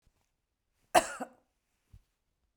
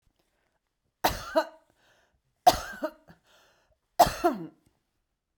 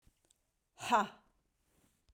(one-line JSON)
{"cough_length": "2.6 s", "cough_amplitude": 13213, "cough_signal_mean_std_ratio": 0.17, "three_cough_length": "5.4 s", "three_cough_amplitude": 18758, "three_cough_signal_mean_std_ratio": 0.25, "exhalation_length": "2.1 s", "exhalation_amplitude": 4863, "exhalation_signal_mean_std_ratio": 0.25, "survey_phase": "beta (2021-08-13 to 2022-03-07)", "age": "45-64", "gender": "Female", "wearing_mask": "No", "symptom_none": true, "smoker_status": "Never smoked", "respiratory_condition_asthma": true, "respiratory_condition_other": false, "recruitment_source": "REACT", "submission_delay": "1 day", "covid_test_result": "Negative", "covid_test_method": "RT-qPCR", "influenza_a_test_result": "Unknown/Void", "influenza_b_test_result": "Unknown/Void"}